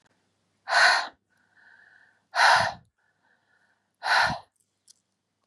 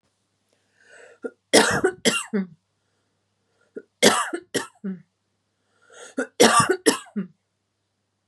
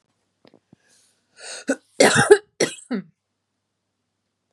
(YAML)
exhalation_length: 5.5 s
exhalation_amplitude: 16269
exhalation_signal_mean_std_ratio: 0.35
three_cough_length: 8.3 s
three_cough_amplitude: 32767
three_cough_signal_mean_std_ratio: 0.34
cough_length: 4.5 s
cough_amplitude: 32767
cough_signal_mean_std_ratio: 0.26
survey_phase: beta (2021-08-13 to 2022-03-07)
age: 45-64
gender: Female
wearing_mask: 'No'
symptom_none: true
smoker_status: Never smoked
respiratory_condition_asthma: false
respiratory_condition_other: false
recruitment_source: REACT
submission_delay: 0 days
covid_test_result: Negative
covid_test_method: RT-qPCR
influenza_a_test_result: Negative
influenza_b_test_result: Negative